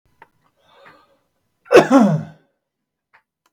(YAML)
cough_length: 3.5 s
cough_amplitude: 32768
cough_signal_mean_std_ratio: 0.28
survey_phase: beta (2021-08-13 to 2022-03-07)
age: 18-44
gender: Male
wearing_mask: 'No'
symptom_none: true
smoker_status: Ex-smoker
respiratory_condition_asthma: true
respiratory_condition_other: false
recruitment_source: Test and Trace
submission_delay: 1 day
covid_test_result: Negative
covid_test_method: RT-qPCR